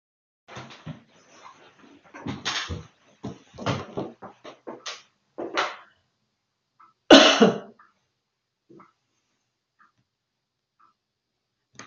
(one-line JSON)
{"cough_length": "11.9 s", "cough_amplitude": 28905, "cough_signal_mean_std_ratio": 0.22, "survey_phase": "beta (2021-08-13 to 2022-03-07)", "age": "65+", "gender": "Female", "wearing_mask": "No", "symptom_none": true, "smoker_status": "Never smoked", "respiratory_condition_asthma": false, "respiratory_condition_other": false, "recruitment_source": "REACT", "submission_delay": "1 day", "covid_test_result": "Negative", "covid_test_method": "RT-qPCR", "influenza_a_test_result": "Negative", "influenza_b_test_result": "Negative"}